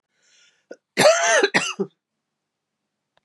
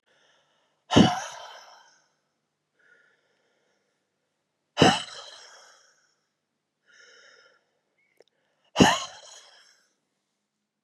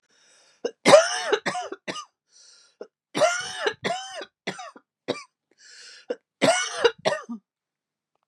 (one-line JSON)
{"cough_length": "3.2 s", "cough_amplitude": 26329, "cough_signal_mean_std_ratio": 0.37, "exhalation_length": "10.8 s", "exhalation_amplitude": 24305, "exhalation_signal_mean_std_ratio": 0.21, "three_cough_length": "8.3 s", "three_cough_amplitude": 29769, "three_cough_signal_mean_std_ratio": 0.36, "survey_phase": "beta (2021-08-13 to 2022-03-07)", "age": "45-64", "gender": "Female", "wearing_mask": "No", "symptom_cough_any": true, "symptom_runny_or_blocked_nose": true, "symptom_sore_throat": true, "symptom_headache": true, "smoker_status": "Ex-smoker", "respiratory_condition_asthma": false, "respiratory_condition_other": false, "recruitment_source": "Test and Trace", "submission_delay": "1 day", "covid_test_result": "Positive", "covid_test_method": "LFT"}